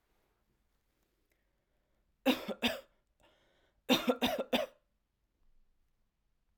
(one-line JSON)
{"cough_length": "6.6 s", "cough_amplitude": 7442, "cough_signal_mean_std_ratio": 0.28, "survey_phase": "alpha (2021-03-01 to 2021-08-12)", "age": "18-44", "gender": "Female", "wearing_mask": "No", "symptom_none": true, "smoker_status": "Never smoked", "respiratory_condition_asthma": false, "respiratory_condition_other": false, "recruitment_source": "REACT", "submission_delay": "3 days", "covid_test_result": "Negative", "covid_test_method": "RT-qPCR"}